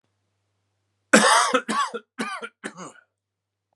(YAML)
cough_length: 3.8 s
cough_amplitude: 31571
cough_signal_mean_std_ratio: 0.36
survey_phase: beta (2021-08-13 to 2022-03-07)
age: 18-44
gender: Male
wearing_mask: 'No'
symptom_cough_any: true
symptom_runny_or_blocked_nose: true
symptom_fatigue: true
symptom_headache: true
symptom_onset: 3 days
smoker_status: Never smoked
respiratory_condition_asthma: false
respiratory_condition_other: false
recruitment_source: Test and Trace
submission_delay: 2 days
covid_test_result: Positive
covid_test_method: RT-qPCR
covid_ct_value: 32.2
covid_ct_gene: ORF1ab gene